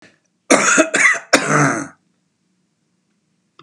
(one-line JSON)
{"cough_length": "3.6 s", "cough_amplitude": 32768, "cough_signal_mean_std_ratio": 0.45, "survey_phase": "beta (2021-08-13 to 2022-03-07)", "age": "45-64", "gender": "Male", "wearing_mask": "No", "symptom_none": true, "smoker_status": "Never smoked", "respiratory_condition_asthma": false, "respiratory_condition_other": false, "recruitment_source": "REACT", "submission_delay": "0 days", "covid_test_result": "Negative", "covid_test_method": "RT-qPCR", "influenza_a_test_result": "Negative", "influenza_b_test_result": "Negative"}